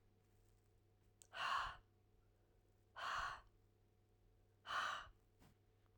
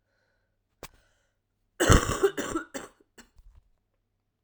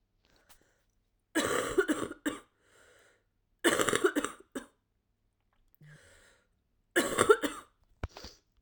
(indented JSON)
{
  "exhalation_length": "6.0 s",
  "exhalation_amplitude": 918,
  "exhalation_signal_mean_std_ratio": 0.42,
  "cough_length": "4.4 s",
  "cough_amplitude": 20977,
  "cough_signal_mean_std_ratio": 0.27,
  "three_cough_length": "8.6 s",
  "three_cough_amplitude": 13169,
  "three_cough_signal_mean_std_ratio": 0.34,
  "survey_phase": "alpha (2021-03-01 to 2021-08-12)",
  "age": "18-44",
  "gender": "Female",
  "wearing_mask": "No",
  "symptom_cough_any": true,
  "symptom_shortness_of_breath": true,
  "symptom_fatigue": true,
  "symptom_fever_high_temperature": true,
  "symptom_headache": true,
  "symptom_onset": "2 days",
  "smoker_status": "Current smoker (1 to 10 cigarettes per day)",
  "respiratory_condition_asthma": false,
  "respiratory_condition_other": false,
  "recruitment_source": "Test and Trace",
  "submission_delay": "1 day",
  "covid_test_result": "Positive",
  "covid_test_method": "RT-qPCR",
  "covid_ct_value": 16.6,
  "covid_ct_gene": "ORF1ab gene",
  "covid_ct_mean": 17.6,
  "covid_viral_load": "1600000 copies/ml",
  "covid_viral_load_category": "High viral load (>1M copies/ml)"
}